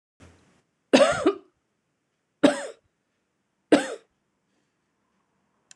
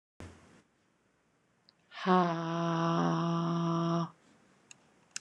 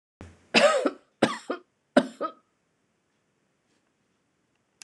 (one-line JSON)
{"three_cough_length": "5.8 s", "three_cough_amplitude": 24472, "three_cough_signal_mean_std_ratio": 0.25, "exhalation_length": "5.2 s", "exhalation_amplitude": 8196, "exhalation_signal_mean_std_ratio": 0.55, "cough_length": "4.8 s", "cough_amplitude": 21483, "cough_signal_mean_std_ratio": 0.28, "survey_phase": "alpha (2021-03-01 to 2021-08-12)", "age": "45-64", "gender": "Female", "wearing_mask": "No", "symptom_cough_any": true, "symptom_fatigue": true, "symptom_fever_high_temperature": true, "symptom_headache": true, "smoker_status": "Ex-smoker", "respiratory_condition_asthma": false, "respiratory_condition_other": false, "recruitment_source": "Test and Trace", "submission_delay": "1 day", "covid_test_result": "Positive", "covid_test_method": "RT-qPCR", "covid_ct_value": 18.4, "covid_ct_gene": "ORF1ab gene", "covid_ct_mean": 18.9, "covid_viral_load": "610000 copies/ml", "covid_viral_load_category": "Low viral load (10K-1M copies/ml)"}